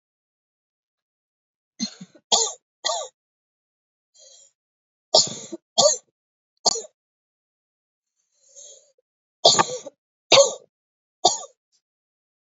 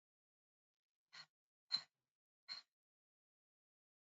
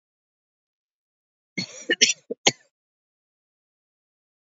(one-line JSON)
{"three_cough_length": "12.5 s", "three_cough_amplitude": 27751, "three_cough_signal_mean_std_ratio": 0.25, "exhalation_length": "4.1 s", "exhalation_amplitude": 1330, "exhalation_signal_mean_std_ratio": 0.16, "cough_length": "4.5 s", "cough_amplitude": 29693, "cough_signal_mean_std_ratio": 0.18, "survey_phase": "alpha (2021-03-01 to 2021-08-12)", "age": "45-64", "gender": "Female", "wearing_mask": "No", "symptom_cough_any": true, "symptom_diarrhoea": true, "symptom_fatigue": true, "symptom_headache": true, "symptom_change_to_sense_of_smell_or_taste": true, "symptom_loss_of_taste": true, "symptom_onset": "3 days", "smoker_status": "Never smoked", "respiratory_condition_asthma": false, "respiratory_condition_other": false, "recruitment_source": "Test and Trace", "submission_delay": "2 days", "covid_test_result": "Positive", "covid_test_method": "RT-qPCR", "covid_ct_value": 14.9, "covid_ct_gene": "ORF1ab gene", "covid_ct_mean": 15.3, "covid_viral_load": "9300000 copies/ml", "covid_viral_load_category": "High viral load (>1M copies/ml)"}